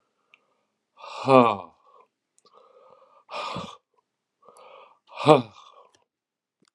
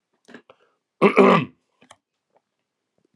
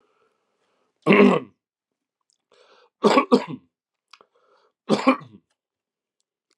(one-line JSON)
{"exhalation_length": "6.7 s", "exhalation_amplitude": 32552, "exhalation_signal_mean_std_ratio": 0.22, "cough_length": "3.2 s", "cough_amplitude": 30112, "cough_signal_mean_std_ratio": 0.27, "three_cough_length": "6.6 s", "three_cough_amplitude": 28321, "three_cough_signal_mean_std_ratio": 0.28, "survey_phase": "alpha (2021-03-01 to 2021-08-12)", "age": "45-64", "gender": "Male", "wearing_mask": "No", "symptom_cough_any": true, "symptom_fatigue": true, "symptom_change_to_sense_of_smell_or_taste": true, "symptom_onset": "4 days", "smoker_status": "Current smoker (1 to 10 cigarettes per day)", "respiratory_condition_asthma": false, "respiratory_condition_other": false, "recruitment_source": "Test and Trace", "submission_delay": "2 days", "covid_test_result": "Positive", "covid_test_method": "RT-qPCR", "covid_ct_value": 15.8, "covid_ct_gene": "ORF1ab gene", "covid_ct_mean": 16.3, "covid_viral_load": "4600000 copies/ml", "covid_viral_load_category": "High viral load (>1M copies/ml)"}